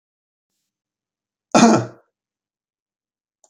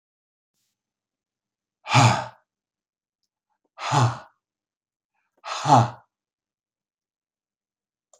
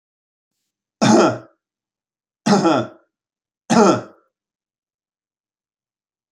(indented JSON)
{
  "cough_length": "3.5 s",
  "cough_amplitude": 29835,
  "cough_signal_mean_std_ratio": 0.23,
  "exhalation_length": "8.2 s",
  "exhalation_amplitude": 23618,
  "exhalation_signal_mean_std_ratio": 0.26,
  "three_cough_length": "6.3 s",
  "three_cough_amplitude": 31239,
  "three_cough_signal_mean_std_ratio": 0.33,
  "survey_phase": "alpha (2021-03-01 to 2021-08-12)",
  "age": "65+",
  "gender": "Male",
  "wearing_mask": "No",
  "symptom_none": true,
  "smoker_status": "Ex-smoker",
  "respiratory_condition_asthma": false,
  "respiratory_condition_other": false,
  "recruitment_source": "REACT",
  "submission_delay": "1 day",
  "covid_test_result": "Negative",
  "covid_test_method": "RT-qPCR"
}